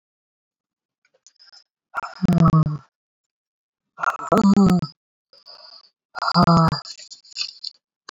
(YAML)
exhalation_length: 8.1 s
exhalation_amplitude: 25184
exhalation_signal_mean_std_ratio: 0.4
survey_phase: beta (2021-08-13 to 2022-03-07)
age: 18-44
gender: Female
wearing_mask: 'No'
symptom_cough_any: true
symptom_runny_or_blocked_nose: true
symptom_fatigue: true
symptom_fever_high_temperature: true
symptom_headache: true
symptom_change_to_sense_of_smell_or_taste: true
symptom_loss_of_taste: true
smoker_status: Never smoked
respiratory_condition_asthma: false
respiratory_condition_other: false
recruitment_source: Test and Trace
submission_delay: 1 day
covid_test_result: Positive
covid_test_method: LFT